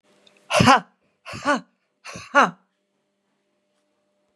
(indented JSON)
{
  "exhalation_length": "4.4 s",
  "exhalation_amplitude": 31342,
  "exhalation_signal_mean_std_ratio": 0.28,
  "survey_phase": "beta (2021-08-13 to 2022-03-07)",
  "age": "65+",
  "gender": "Female",
  "wearing_mask": "No",
  "symptom_none": true,
  "smoker_status": "Ex-smoker",
  "respiratory_condition_asthma": false,
  "respiratory_condition_other": false,
  "recruitment_source": "REACT",
  "submission_delay": "1 day",
  "covid_test_result": "Negative",
  "covid_test_method": "RT-qPCR",
  "influenza_a_test_result": "Negative",
  "influenza_b_test_result": "Negative"
}